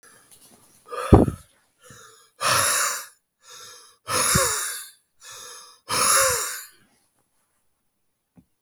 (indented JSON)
{
  "exhalation_length": "8.6 s",
  "exhalation_amplitude": 32766,
  "exhalation_signal_mean_std_ratio": 0.39,
  "survey_phase": "beta (2021-08-13 to 2022-03-07)",
  "age": "45-64",
  "gender": "Male",
  "wearing_mask": "No",
  "symptom_cough_any": true,
  "symptom_runny_or_blocked_nose": true,
  "symptom_fatigue": true,
  "symptom_headache": true,
  "symptom_change_to_sense_of_smell_or_taste": true,
  "symptom_onset": "3 days",
  "smoker_status": "Ex-smoker",
  "respiratory_condition_asthma": false,
  "respiratory_condition_other": false,
  "recruitment_source": "Test and Trace",
  "submission_delay": "2 days",
  "covid_test_result": "Positive",
  "covid_test_method": "RT-qPCR",
  "covid_ct_value": 17.9,
  "covid_ct_gene": "ORF1ab gene",
  "covid_ct_mean": 18.6,
  "covid_viral_load": "790000 copies/ml",
  "covid_viral_load_category": "Low viral load (10K-1M copies/ml)"
}